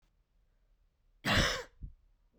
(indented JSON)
{
  "cough_length": "2.4 s",
  "cough_amplitude": 6753,
  "cough_signal_mean_std_ratio": 0.34,
  "survey_phase": "beta (2021-08-13 to 2022-03-07)",
  "age": "18-44",
  "gender": "Female",
  "wearing_mask": "No",
  "symptom_cough_any": true,
  "symptom_fatigue": true,
  "symptom_other": true,
  "symptom_onset": "7 days",
  "smoker_status": "Never smoked",
  "respiratory_condition_asthma": false,
  "respiratory_condition_other": false,
  "recruitment_source": "Test and Trace",
  "submission_delay": "1 day",
  "covid_test_result": "Negative",
  "covid_test_method": "RT-qPCR"
}